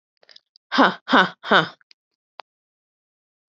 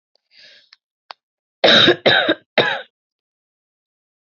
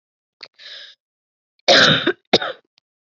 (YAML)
exhalation_length: 3.6 s
exhalation_amplitude: 27925
exhalation_signal_mean_std_ratio: 0.26
three_cough_length: 4.3 s
three_cough_amplitude: 30888
three_cough_signal_mean_std_ratio: 0.34
cough_length: 3.2 s
cough_amplitude: 31959
cough_signal_mean_std_ratio: 0.33
survey_phase: beta (2021-08-13 to 2022-03-07)
age: 18-44
gender: Female
wearing_mask: 'No'
symptom_new_continuous_cough: true
symptom_runny_or_blocked_nose: true
symptom_sore_throat: true
symptom_headache: true
symptom_onset: 2 days
smoker_status: Never smoked
respiratory_condition_asthma: false
respiratory_condition_other: false
recruitment_source: Test and Trace
submission_delay: 1 day
covid_test_result: Positive
covid_test_method: RT-qPCR
covid_ct_value: 26.2
covid_ct_gene: N gene